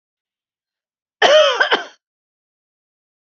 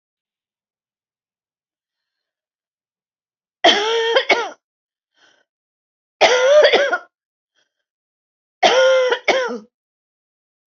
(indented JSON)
{
  "cough_length": "3.2 s",
  "cough_amplitude": 27297,
  "cough_signal_mean_std_ratio": 0.32,
  "three_cough_length": "10.8 s",
  "three_cough_amplitude": 27571,
  "three_cough_signal_mean_std_ratio": 0.38,
  "survey_phase": "beta (2021-08-13 to 2022-03-07)",
  "age": "65+",
  "gender": "Female",
  "wearing_mask": "No",
  "symptom_none": true,
  "smoker_status": "Never smoked",
  "respiratory_condition_asthma": false,
  "respiratory_condition_other": false,
  "recruitment_source": "REACT",
  "submission_delay": "3 days",
  "covid_test_result": "Negative",
  "covid_test_method": "RT-qPCR",
  "influenza_a_test_result": "Negative",
  "influenza_b_test_result": "Negative"
}